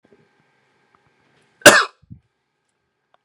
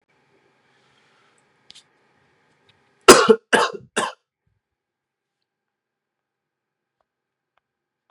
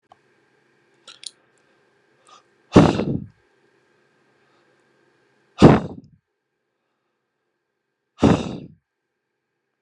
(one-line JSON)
{"cough_length": "3.2 s", "cough_amplitude": 32768, "cough_signal_mean_std_ratio": 0.18, "three_cough_length": "8.1 s", "three_cough_amplitude": 32768, "three_cough_signal_mean_std_ratio": 0.17, "exhalation_length": "9.8 s", "exhalation_amplitude": 32768, "exhalation_signal_mean_std_ratio": 0.21, "survey_phase": "beta (2021-08-13 to 2022-03-07)", "age": "18-44", "gender": "Male", "wearing_mask": "No", "symptom_cough_any": true, "symptom_onset": "8 days", "smoker_status": "Never smoked", "recruitment_source": "REACT", "submission_delay": "1 day", "covid_test_result": "Negative", "covid_test_method": "RT-qPCR", "influenza_a_test_result": "Unknown/Void", "influenza_b_test_result": "Unknown/Void"}